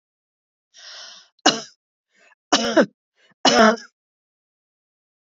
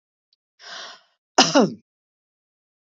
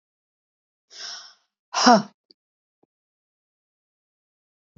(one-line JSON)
{"three_cough_length": "5.3 s", "three_cough_amplitude": 28865, "three_cough_signal_mean_std_ratio": 0.29, "cough_length": "2.8 s", "cough_amplitude": 29585, "cough_signal_mean_std_ratio": 0.26, "exhalation_length": "4.8 s", "exhalation_amplitude": 27686, "exhalation_signal_mean_std_ratio": 0.19, "survey_phase": "beta (2021-08-13 to 2022-03-07)", "age": "45-64", "gender": "Female", "wearing_mask": "No", "symptom_none": true, "smoker_status": "Never smoked", "respiratory_condition_asthma": false, "respiratory_condition_other": false, "recruitment_source": "REACT", "submission_delay": "2 days", "covid_test_result": "Negative", "covid_test_method": "RT-qPCR", "influenza_a_test_result": "Negative", "influenza_b_test_result": "Negative"}